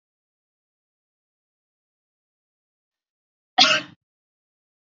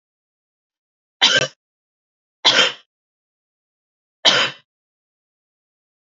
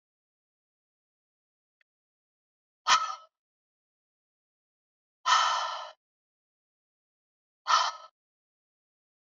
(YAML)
cough_length: 4.9 s
cough_amplitude: 28776
cough_signal_mean_std_ratio: 0.16
three_cough_length: 6.1 s
three_cough_amplitude: 32422
three_cough_signal_mean_std_ratio: 0.27
exhalation_length: 9.2 s
exhalation_amplitude: 10802
exhalation_signal_mean_std_ratio: 0.25
survey_phase: beta (2021-08-13 to 2022-03-07)
age: 18-44
gender: Female
wearing_mask: 'No'
symptom_cough_any: true
symptom_runny_or_blocked_nose: true
symptom_sore_throat: true
symptom_fever_high_temperature: true
symptom_headache: true
symptom_change_to_sense_of_smell_or_taste: true
symptom_other: true
symptom_onset: 4 days
smoker_status: Never smoked
respiratory_condition_asthma: false
respiratory_condition_other: false
recruitment_source: Test and Trace
submission_delay: 1 day
covid_test_result: Positive
covid_test_method: RT-qPCR